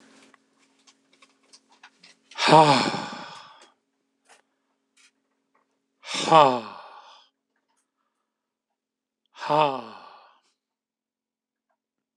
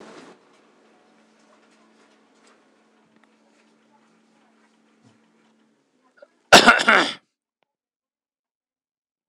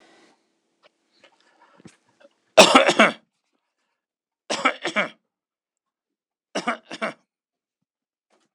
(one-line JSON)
{"exhalation_length": "12.2 s", "exhalation_amplitude": 26028, "exhalation_signal_mean_std_ratio": 0.24, "cough_length": "9.3 s", "cough_amplitude": 26028, "cough_signal_mean_std_ratio": 0.18, "three_cough_length": "8.5 s", "three_cough_amplitude": 26028, "three_cough_signal_mean_std_ratio": 0.23, "survey_phase": "beta (2021-08-13 to 2022-03-07)", "age": "45-64", "gender": "Male", "wearing_mask": "Yes", "symptom_none": true, "smoker_status": "Never smoked", "respiratory_condition_asthma": false, "respiratory_condition_other": false, "recruitment_source": "REACT", "submission_delay": "1 day", "covid_test_result": "Negative", "covid_test_method": "RT-qPCR"}